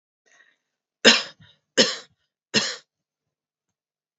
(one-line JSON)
{"three_cough_length": "4.2 s", "three_cough_amplitude": 32767, "three_cough_signal_mean_std_ratio": 0.24, "survey_phase": "alpha (2021-03-01 to 2021-08-12)", "age": "45-64", "gender": "Female", "wearing_mask": "No", "symptom_cough_any": true, "symptom_diarrhoea": true, "symptom_fatigue": true, "symptom_headache": true, "symptom_onset": "6 days", "smoker_status": "Never smoked", "respiratory_condition_asthma": false, "respiratory_condition_other": false, "recruitment_source": "Test and Trace", "submission_delay": "2 days", "covid_test_result": "Positive", "covid_test_method": "RT-qPCR", "covid_ct_value": 25.5, "covid_ct_gene": "ORF1ab gene", "covid_ct_mean": 26.4, "covid_viral_load": "2200 copies/ml", "covid_viral_load_category": "Minimal viral load (< 10K copies/ml)"}